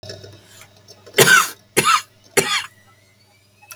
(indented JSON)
{
  "three_cough_length": "3.8 s",
  "three_cough_amplitude": 32768,
  "three_cough_signal_mean_std_ratio": 0.37,
  "survey_phase": "beta (2021-08-13 to 2022-03-07)",
  "age": "18-44",
  "gender": "Male",
  "wearing_mask": "No",
  "symptom_none": true,
  "smoker_status": "Current smoker (11 or more cigarettes per day)",
  "respiratory_condition_asthma": false,
  "respiratory_condition_other": false,
  "recruitment_source": "REACT",
  "submission_delay": "1 day",
  "covid_test_result": "Negative",
  "covid_test_method": "RT-qPCR",
  "influenza_a_test_result": "Negative",
  "influenza_b_test_result": "Negative"
}